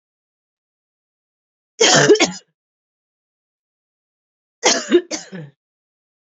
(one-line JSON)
{"cough_length": "6.2 s", "cough_amplitude": 30128, "cough_signal_mean_std_ratio": 0.29, "survey_phase": "beta (2021-08-13 to 2022-03-07)", "age": "18-44", "gender": "Female", "wearing_mask": "No", "symptom_runny_or_blocked_nose": true, "symptom_shortness_of_breath": true, "symptom_abdominal_pain": true, "symptom_headache": true, "symptom_change_to_sense_of_smell_or_taste": true, "symptom_loss_of_taste": true, "symptom_other": true, "smoker_status": "Ex-smoker", "respiratory_condition_asthma": false, "respiratory_condition_other": false, "recruitment_source": "Test and Trace", "submission_delay": "1 day", "covid_test_result": "Positive", "covid_test_method": "ePCR"}